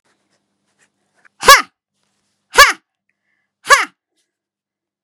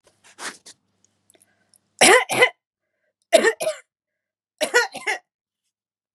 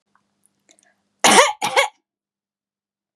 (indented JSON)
{
  "exhalation_length": "5.0 s",
  "exhalation_amplitude": 32768,
  "exhalation_signal_mean_std_ratio": 0.23,
  "three_cough_length": "6.1 s",
  "three_cough_amplitude": 30944,
  "three_cough_signal_mean_std_ratio": 0.3,
  "cough_length": "3.2 s",
  "cough_amplitude": 32767,
  "cough_signal_mean_std_ratio": 0.29,
  "survey_phase": "beta (2021-08-13 to 2022-03-07)",
  "age": "45-64",
  "gender": "Female",
  "wearing_mask": "No",
  "symptom_none": true,
  "smoker_status": "Never smoked",
  "respiratory_condition_asthma": false,
  "respiratory_condition_other": false,
  "recruitment_source": "REACT",
  "submission_delay": "2 days",
  "covid_test_result": "Negative",
  "covid_test_method": "RT-qPCR",
  "influenza_a_test_result": "Negative",
  "influenza_b_test_result": "Negative"
}